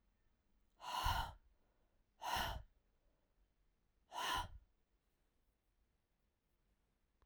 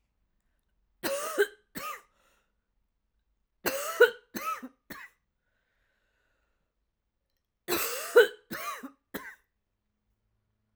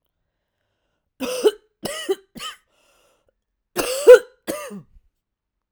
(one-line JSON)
{"exhalation_length": "7.3 s", "exhalation_amplitude": 1657, "exhalation_signal_mean_std_ratio": 0.35, "three_cough_length": "10.8 s", "three_cough_amplitude": 15214, "three_cough_signal_mean_std_ratio": 0.26, "cough_length": "5.7 s", "cough_amplitude": 32768, "cough_signal_mean_std_ratio": 0.23, "survey_phase": "alpha (2021-03-01 to 2021-08-12)", "age": "18-44", "gender": "Female", "wearing_mask": "No", "symptom_cough_any": true, "symptom_fatigue": true, "symptom_fever_high_temperature": true, "symptom_onset": "2 days", "smoker_status": "Ex-smoker", "respiratory_condition_asthma": false, "respiratory_condition_other": false, "recruitment_source": "Test and Trace", "submission_delay": "1 day", "covid_test_result": "Positive", "covid_test_method": "RT-qPCR"}